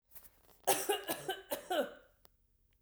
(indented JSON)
{
  "three_cough_length": "2.8 s",
  "three_cough_amplitude": 6590,
  "three_cough_signal_mean_std_ratio": 0.44,
  "survey_phase": "beta (2021-08-13 to 2022-03-07)",
  "age": "45-64",
  "gender": "Female",
  "wearing_mask": "No",
  "symptom_runny_or_blocked_nose": true,
  "smoker_status": "Never smoked",
  "respiratory_condition_asthma": false,
  "respiratory_condition_other": false,
  "recruitment_source": "Test and Trace",
  "submission_delay": "2 days",
  "covid_test_result": "Positive",
  "covid_test_method": "RT-qPCR",
  "covid_ct_value": 27.1,
  "covid_ct_gene": "N gene"
}